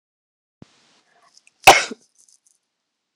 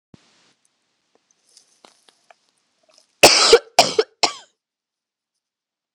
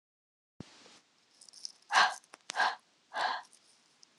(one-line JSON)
{"cough_length": "3.2 s", "cough_amplitude": 26028, "cough_signal_mean_std_ratio": 0.17, "three_cough_length": "5.9 s", "three_cough_amplitude": 26028, "three_cough_signal_mean_std_ratio": 0.23, "exhalation_length": "4.2 s", "exhalation_amplitude": 9832, "exhalation_signal_mean_std_ratio": 0.31, "survey_phase": "beta (2021-08-13 to 2022-03-07)", "age": "18-44", "gender": "Female", "wearing_mask": "No", "symptom_cough_any": true, "symptom_sore_throat": true, "symptom_fatigue": true, "symptom_fever_high_temperature": true, "symptom_headache": true, "symptom_onset": "2 days", "smoker_status": "Never smoked", "respiratory_condition_asthma": false, "respiratory_condition_other": false, "recruitment_source": "Test and Trace", "submission_delay": "1 day", "covid_test_result": "Positive", "covid_test_method": "RT-qPCR", "covid_ct_value": 29.4, "covid_ct_gene": "N gene"}